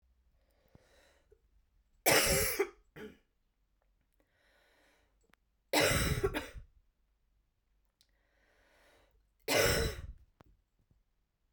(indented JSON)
{
  "three_cough_length": "11.5 s",
  "three_cough_amplitude": 7327,
  "three_cough_signal_mean_std_ratio": 0.33,
  "survey_phase": "beta (2021-08-13 to 2022-03-07)",
  "age": "18-44",
  "gender": "Female",
  "wearing_mask": "No",
  "symptom_cough_any": true,
  "symptom_new_continuous_cough": true,
  "symptom_runny_or_blocked_nose": true,
  "symptom_shortness_of_breath": true,
  "symptom_fatigue": true,
  "symptom_change_to_sense_of_smell_or_taste": true,
  "symptom_loss_of_taste": true,
  "smoker_status": "Never smoked",
  "respiratory_condition_asthma": false,
  "respiratory_condition_other": false,
  "recruitment_source": "Test and Trace",
  "submission_delay": "3 days",
  "covid_test_result": "Positive",
  "covid_test_method": "RT-qPCR",
  "covid_ct_value": 26.5,
  "covid_ct_gene": "ORF1ab gene",
  "covid_ct_mean": 27.2,
  "covid_viral_load": "1200 copies/ml",
  "covid_viral_load_category": "Minimal viral load (< 10K copies/ml)"
}